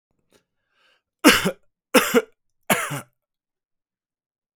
{"three_cough_length": "4.6 s", "three_cough_amplitude": 32767, "three_cough_signal_mean_std_ratio": 0.28, "survey_phase": "beta (2021-08-13 to 2022-03-07)", "age": "45-64", "gender": "Male", "wearing_mask": "No", "symptom_runny_or_blocked_nose": true, "smoker_status": "Never smoked", "respiratory_condition_asthma": false, "respiratory_condition_other": false, "recruitment_source": "Test and Trace", "submission_delay": "1 day", "covid_test_result": "Negative", "covid_test_method": "RT-qPCR"}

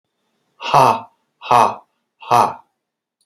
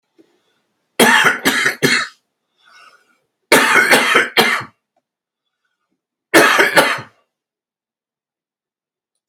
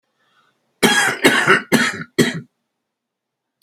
{"exhalation_length": "3.3 s", "exhalation_amplitude": 32767, "exhalation_signal_mean_std_ratio": 0.37, "three_cough_length": "9.3 s", "three_cough_amplitude": 32768, "three_cough_signal_mean_std_ratio": 0.42, "cough_length": "3.6 s", "cough_amplitude": 32768, "cough_signal_mean_std_ratio": 0.45, "survey_phase": "beta (2021-08-13 to 2022-03-07)", "age": "65+", "gender": "Male", "wearing_mask": "No", "symptom_cough_any": true, "symptom_runny_or_blocked_nose": true, "symptom_fatigue": true, "symptom_headache": true, "symptom_onset": "9 days", "smoker_status": "Ex-smoker", "respiratory_condition_asthma": true, "respiratory_condition_other": true, "recruitment_source": "REACT", "submission_delay": "0 days", "covid_test_result": "Negative", "covid_test_method": "RT-qPCR", "influenza_a_test_result": "Negative", "influenza_b_test_result": "Negative"}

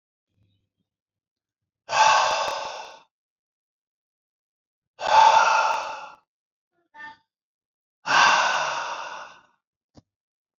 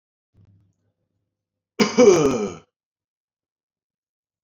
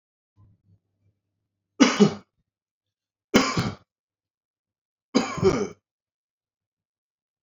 {"exhalation_length": "10.6 s", "exhalation_amplitude": 20372, "exhalation_signal_mean_std_ratio": 0.39, "cough_length": "4.4 s", "cough_amplitude": 26891, "cough_signal_mean_std_ratio": 0.28, "three_cough_length": "7.4 s", "three_cough_amplitude": 27682, "three_cough_signal_mean_std_ratio": 0.27, "survey_phase": "beta (2021-08-13 to 2022-03-07)", "age": "18-44", "gender": "Male", "wearing_mask": "No", "symptom_headache": true, "smoker_status": "Ex-smoker", "respiratory_condition_asthma": false, "respiratory_condition_other": false, "recruitment_source": "REACT", "submission_delay": "1 day", "covid_test_result": "Negative", "covid_test_method": "RT-qPCR"}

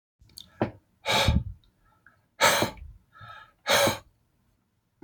{"exhalation_length": "5.0 s", "exhalation_amplitude": 14322, "exhalation_signal_mean_std_ratio": 0.39, "survey_phase": "beta (2021-08-13 to 2022-03-07)", "age": "45-64", "gender": "Male", "wearing_mask": "No", "symptom_none": true, "smoker_status": "Ex-smoker", "respiratory_condition_asthma": false, "respiratory_condition_other": false, "recruitment_source": "REACT", "submission_delay": "0 days", "covid_test_result": "Negative", "covid_test_method": "RT-qPCR", "influenza_a_test_result": "Negative", "influenza_b_test_result": "Negative"}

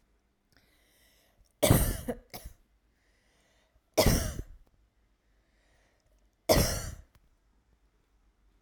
{"three_cough_length": "8.6 s", "three_cough_amplitude": 15172, "three_cough_signal_mean_std_ratio": 0.29, "survey_phase": "alpha (2021-03-01 to 2021-08-12)", "age": "18-44", "gender": "Female", "wearing_mask": "No", "symptom_none": true, "smoker_status": "Never smoked", "respiratory_condition_asthma": false, "respiratory_condition_other": false, "recruitment_source": "REACT", "submission_delay": "1 day", "covid_test_result": "Negative", "covid_test_method": "RT-qPCR"}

